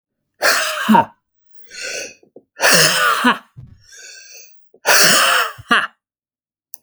exhalation_length: 6.8 s
exhalation_amplitude: 32768
exhalation_signal_mean_std_ratio: 0.49
survey_phase: alpha (2021-03-01 to 2021-08-12)
age: 45-64
gender: Male
wearing_mask: 'No'
symptom_none: true
smoker_status: Never smoked
respiratory_condition_asthma: false
respiratory_condition_other: false
recruitment_source: REACT
submission_delay: 2 days
covid_test_result: Negative
covid_test_method: RT-qPCR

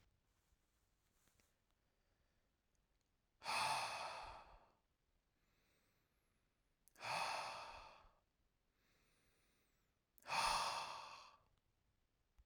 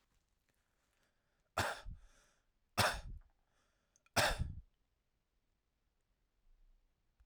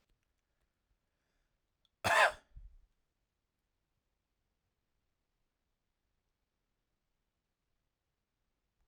exhalation_length: 12.5 s
exhalation_amplitude: 1410
exhalation_signal_mean_std_ratio: 0.36
three_cough_length: 7.3 s
three_cough_amplitude: 3766
three_cough_signal_mean_std_ratio: 0.28
cough_length: 8.9 s
cough_amplitude: 6133
cough_signal_mean_std_ratio: 0.14
survey_phase: alpha (2021-03-01 to 2021-08-12)
age: 18-44
gender: Male
wearing_mask: 'No'
symptom_none: true
smoker_status: Never smoked
respiratory_condition_asthma: false
respiratory_condition_other: false
recruitment_source: REACT
submission_delay: 2 days
covid_test_result: Negative
covid_test_method: RT-qPCR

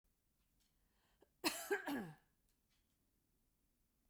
cough_length: 4.1 s
cough_amplitude: 2414
cough_signal_mean_std_ratio: 0.29
survey_phase: beta (2021-08-13 to 2022-03-07)
age: 65+
gender: Female
wearing_mask: 'No'
symptom_none: true
smoker_status: Ex-smoker
respiratory_condition_asthma: false
respiratory_condition_other: false
recruitment_source: REACT
submission_delay: 1 day
covid_test_result: Negative
covid_test_method: RT-qPCR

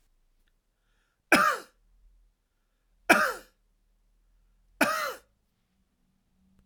three_cough_length: 6.7 s
three_cough_amplitude: 18626
three_cough_signal_mean_std_ratio: 0.26
survey_phase: alpha (2021-03-01 to 2021-08-12)
age: 45-64
gender: Male
wearing_mask: 'No'
symptom_none: true
smoker_status: Never smoked
respiratory_condition_asthma: false
respiratory_condition_other: false
recruitment_source: REACT
submission_delay: 2 days
covid_test_result: Negative
covid_test_method: RT-qPCR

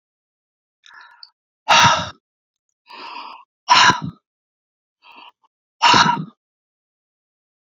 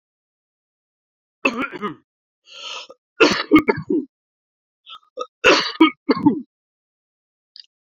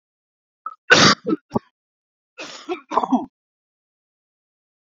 exhalation_length: 7.8 s
exhalation_amplitude: 29404
exhalation_signal_mean_std_ratio: 0.31
three_cough_length: 7.9 s
three_cough_amplitude: 32210
three_cough_signal_mean_std_ratio: 0.33
cough_length: 4.9 s
cough_amplitude: 31693
cough_signal_mean_std_ratio: 0.28
survey_phase: beta (2021-08-13 to 2022-03-07)
age: 45-64
gender: Male
wearing_mask: 'No'
symptom_cough_any: true
symptom_headache: true
symptom_onset: 8 days
smoker_status: Never smoked
respiratory_condition_asthma: true
respiratory_condition_other: false
recruitment_source: Test and Trace
submission_delay: 2 days
covid_test_method: RT-qPCR
covid_ct_value: 29.6
covid_ct_gene: N gene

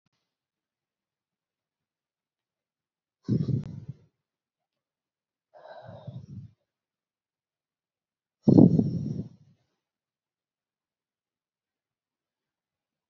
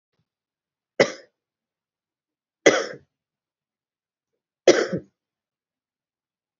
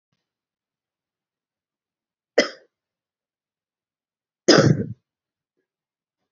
exhalation_length: 13.1 s
exhalation_amplitude: 23482
exhalation_signal_mean_std_ratio: 0.19
three_cough_length: 6.6 s
three_cough_amplitude: 30157
three_cough_signal_mean_std_ratio: 0.19
cough_length: 6.3 s
cough_amplitude: 30969
cough_signal_mean_std_ratio: 0.19
survey_phase: alpha (2021-03-01 to 2021-08-12)
age: 18-44
gender: Female
wearing_mask: 'Yes'
symptom_cough_any: true
symptom_change_to_sense_of_smell_or_taste: true
symptom_loss_of_taste: true
symptom_onset: 3 days
smoker_status: Never smoked
respiratory_condition_asthma: false
respiratory_condition_other: false
recruitment_source: Test and Trace
submission_delay: 2 days
covid_test_result: Positive
covid_test_method: RT-qPCR
covid_ct_value: 17.6
covid_ct_gene: N gene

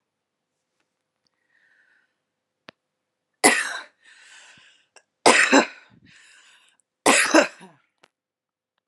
three_cough_length: 8.9 s
three_cough_amplitude: 32343
three_cough_signal_mean_std_ratio: 0.26
survey_phase: beta (2021-08-13 to 2022-03-07)
age: 18-44
gender: Female
wearing_mask: 'No'
symptom_none: true
smoker_status: Never smoked
respiratory_condition_asthma: false
respiratory_condition_other: false
recruitment_source: REACT
submission_delay: 1 day
covid_test_result: Negative
covid_test_method: RT-qPCR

